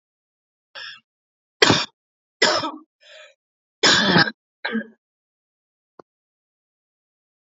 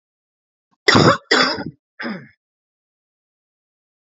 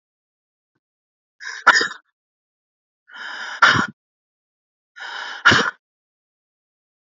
{"three_cough_length": "7.6 s", "three_cough_amplitude": 32768, "three_cough_signal_mean_std_ratio": 0.29, "cough_length": "4.0 s", "cough_amplitude": 32768, "cough_signal_mean_std_ratio": 0.31, "exhalation_length": "7.1 s", "exhalation_amplitude": 32768, "exhalation_signal_mean_std_ratio": 0.28, "survey_phase": "alpha (2021-03-01 to 2021-08-12)", "age": "18-44", "gender": "Female", "wearing_mask": "No", "symptom_cough_any": true, "symptom_headache": true, "symptom_change_to_sense_of_smell_or_taste": true, "symptom_loss_of_taste": true, "smoker_status": "Current smoker (e-cigarettes or vapes only)", "respiratory_condition_asthma": true, "respiratory_condition_other": false, "recruitment_source": "Test and Trace", "submission_delay": "2 days", "covid_test_result": "Positive", "covid_test_method": "RT-qPCR"}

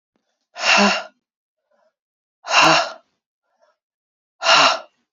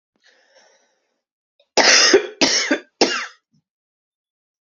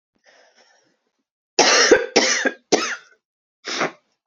{"exhalation_length": "5.1 s", "exhalation_amplitude": 29520, "exhalation_signal_mean_std_ratio": 0.38, "three_cough_length": "4.6 s", "three_cough_amplitude": 32767, "three_cough_signal_mean_std_ratio": 0.37, "cough_length": "4.3 s", "cough_amplitude": 29698, "cough_signal_mean_std_ratio": 0.4, "survey_phase": "beta (2021-08-13 to 2022-03-07)", "age": "45-64", "gender": "Female", "wearing_mask": "No", "symptom_cough_any": true, "symptom_runny_or_blocked_nose": true, "symptom_fatigue": true, "symptom_fever_high_temperature": true, "symptom_headache": true, "symptom_other": true, "smoker_status": "Ex-smoker", "respiratory_condition_asthma": false, "respiratory_condition_other": false, "recruitment_source": "Test and Trace", "submission_delay": "1 day", "covid_test_result": "Positive", "covid_test_method": "RT-qPCR", "covid_ct_value": 28.4, "covid_ct_gene": "N gene"}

